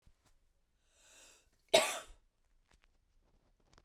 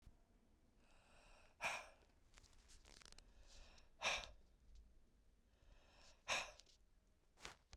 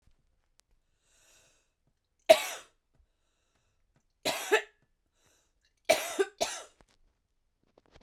{"cough_length": "3.8 s", "cough_amplitude": 7842, "cough_signal_mean_std_ratio": 0.19, "exhalation_length": "7.8 s", "exhalation_amplitude": 1217, "exhalation_signal_mean_std_ratio": 0.38, "three_cough_length": "8.0 s", "three_cough_amplitude": 17950, "three_cough_signal_mean_std_ratio": 0.21, "survey_phase": "beta (2021-08-13 to 2022-03-07)", "age": "45-64", "gender": "Female", "wearing_mask": "No", "symptom_cough_any": true, "symptom_runny_or_blocked_nose": true, "symptom_shortness_of_breath": true, "symptom_sore_throat": true, "symptom_abdominal_pain": true, "symptom_fatigue": true, "symptom_headache": true, "symptom_other": true, "symptom_onset": "3 days", "smoker_status": "Ex-smoker", "respiratory_condition_asthma": false, "respiratory_condition_other": false, "recruitment_source": "Test and Trace", "submission_delay": "1 day", "covid_test_result": "Positive", "covid_test_method": "RT-qPCR", "covid_ct_value": 30.8, "covid_ct_gene": "N gene"}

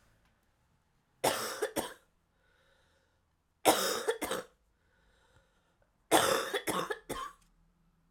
{"three_cough_length": "8.1 s", "three_cough_amplitude": 11953, "three_cough_signal_mean_std_ratio": 0.37, "survey_phase": "alpha (2021-03-01 to 2021-08-12)", "age": "18-44", "gender": "Female", "wearing_mask": "No", "symptom_cough_any": true, "symptom_shortness_of_breath": true, "symptom_fatigue": true, "symptom_fever_high_temperature": true, "symptom_headache": true, "symptom_change_to_sense_of_smell_or_taste": true, "symptom_onset": "3 days", "smoker_status": "Never smoked", "respiratory_condition_asthma": false, "respiratory_condition_other": false, "recruitment_source": "Test and Trace", "submission_delay": "2 days", "covid_test_result": "Positive", "covid_test_method": "RT-qPCR", "covid_ct_value": 26.0, "covid_ct_gene": "ORF1ab gene"}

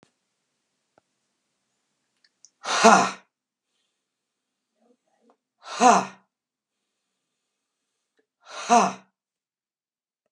{"exhalation_length": "10.3 s", "exhalation_amplitude": 29692, "exhalation_signal_mean_std_ratio": 0.22, "survey_phase": "beta (2021-08-13 to 2022-03-07)", "age": "65+", "gender": "Male", "wearing_mask": "No", "symptom_none": true, "smoker_status": "Never smoked", "respiratory_condition_asthma": false, "respiratory_condition_other": false, "recruitment_source": "REACT", "submission_delay": "0 days", "covid_test_result": "Negative", "covid_test_method": "RT-qPCR"}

